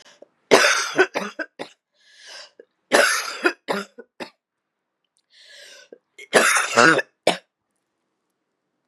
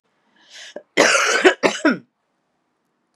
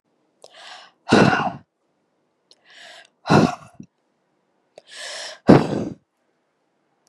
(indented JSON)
{
  "three_cough_length": "8.9 s",
  "three_cough_amplitude": 32768,
  "three_cough_signal_mean_std_ratio": 0.35,
  "cough_length": "3.2 s",
  "cough_amplitude": 32767,
  "cough_signal_mean_std_ratio": 0.4,
  "exhalation_length": "7.1 s",
  "exhalation_amplitude": 32768,
  "exhalation_signal_mean_std_ratio": 0.29,
  "survey_phase": "beta (2021-08-13 to 2022-03-07)",
  "age": "18-44",
  "gender": "Female",
  "wearing_mask": "No",
  "symptom_cough_any": true,
  "symptom_runny_or_blocked_nose": true,
  "symptom_sore_throat": true,
  "symptom_onset": "4 days",
  "smoker_status": "Never smoked",
  "respiratory_condition_asthma": false,
  "respiratory_condition_other": false,
  "recruitment_source": "Test and Trace",
  "submission_delay": "2 days",
  "covid_test_result": "Positive",
  "covid_test_method": "RT-qPCR",
  "covid_ct_value": 29.0,
  "covid_ct_gene": "ORF1ab gene",
  "covid_ct_mean": 29.4,
  "covid_viral_load": "230 copies/ml",
  "covid_viral_load_category": "Minimal viral load (< 10K copies/ml)"
}